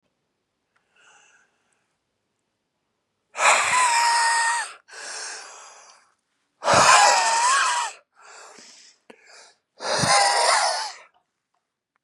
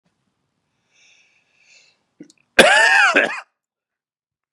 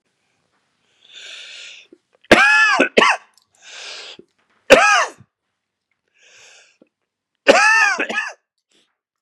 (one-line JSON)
{"exhalation_length": "12.0 s", "exhalation_amplitude": 26673, "exhalation_signal_mean_std_ratio": 0.48, "cough_length": "4.5 s", "cough_amplitude": 32768, "cough_signal_mean_std_ratio": 0.32, "three_cough_length": "9.2 s", "three_cough_amplitude": 32768, "three_cough_signal_mean_std_ratio": 0.37, "survey_phase": "beta (2021-08-13 to 2022-03-07)", "age": "18-44", "gender": "Male", "wearing_mask": "No", "symptom_cough_any": true, "symptom_runny_or_blocked_nose": true, "symptom_shortness_of_breath": true, "symptom_sore_throat": true, "symptom_fatigue": true, "symptom_onset": "4 days", "smoker_status": "Never smoked", "respiratory_condition_asthma": false, "respiratory_condition_other": false, "recruitment_source": "Test and Trace", "submission_delay": "1 day", "covid_test_result": "Negative", "covid_test_method": "RT-qPCR"}